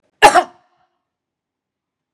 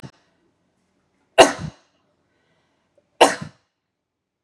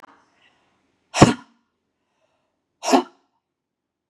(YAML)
cough_length: 2.1 s
cough_amplitude: 32768
cough_signal_mean_std_ratio: 0.23
three_cough_length: 4.4 s
three_cough_amplitude: 32768
three_cough_signal_mean_std_ratio: 0.18
exhalation_length: 4.1 s
exhalation_amplitude: 32768
exhalation_signal_mean_std_ratio: 0.2
survey_phase: beta (2021-08-13 to 2022-03-07)
age: 45-64
gender: Female
wearing_mask: 'No'
symptom_other: true
symptom_onset: 12 days
smoker_status: Never smoked
respiratory_condition_asthma: false
respiratory_condition_other: true
recruitment_source: REACT
submission_delay: 2 days
covid_test_result: Negative
covid_test_method: RT-qPCR
influenza_a_test_result: Negative
influenza_b_test_result: Negative